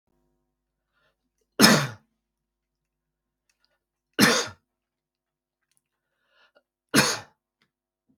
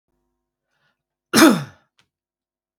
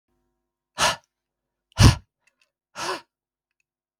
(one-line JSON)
{"three_cough_length": "8.2 s", "three_cough_amplitude": 29366, "three_cough_signal_mean_std_ratio": 0.23, "cough_length": "2.8 s", "cough_amplitude": 32768, "cough_signal_mean_std_ratio": 0.24, "exhalation_length": "4.0 s", "exhalation_amplitude": 32768, "exhalation_signal_mean_std_ratio": 0.22, "survey_phase": "beta (2021-08-13 to 2022-03-07)", "age": "45-64", "gender": "Male", "wearing_mask": "No", "symptom_none": true, "smoker_status": "Ex-smoker", "respiratory_condition_asthma": false, "respiratory_condition_other": false, "recruitment_source": "REACT", "submission_delay": "1 day", "covid_test_result": "Negative", "covid_test_method": "RT-qPCR"}